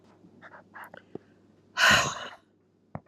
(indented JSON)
{
  "exhalation_length": "3.1 s",
  "exhalation_amplitude": 14282,
  "exhalation_signal_mean_std_ratio": 0.32,
  "survey_phase": "alpha (2021-03-01 to 2021-08-12)",
  "age": "45-64",
  "gender": "Female",
  "wearing_mask": "No",
  "symptom_cough_any": true,
  "symptom_headache": true,
  "symptom_onset": "4 days",
  "smoker_status": "Ex-smoker",
  "respiratory_condition_asthma": false,
  "respiratory_condition_other": false,
  "recruitment_source": "Test and Trace",
  "submission_delay": "2 days",
  "covid_test_result": "Positive",
  "covid_test_method": "RT-qPCR",
  "covid_ct_value": 28.6,
  "covid_ct_gene": "N gene"
}